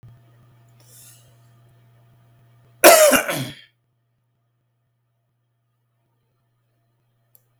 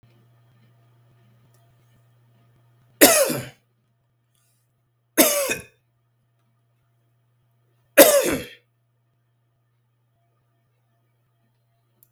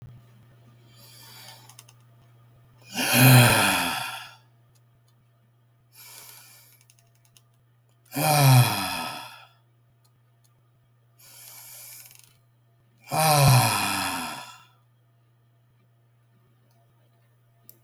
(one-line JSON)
{"cough_length": "7.6 s", "cough_amplitude": 32768, "cough_signal_mean_std_ratio": 0.21, "three_cough_length": "12.1 s", "three_cough_amplitude": 32768, "three_cough_signal_mean_std_ratio": 0.22, "exhalation_length": "17.8 s", "exhalation_amplitude": 22176, "exhalation_signal_mean_std_ratio": 0.34, "survey_phase": "beta (2021-08-13 to 2022-03-07)", "age": "65+", "gender": "Male", "wearing_mask": "No", "symptom_none": true, "smoker_status": "Never smoked", "respiratory_condition_asthma": false, "respiratory_condition_other": false, "recruitment_source": "REACT", "submission_delay": "2 days", "covid_test_result": "Negative", "covid_test_method": "RT-qPCR", "influenza_a_test_result": "Negative", "influenza_b_test_result": "Negative"}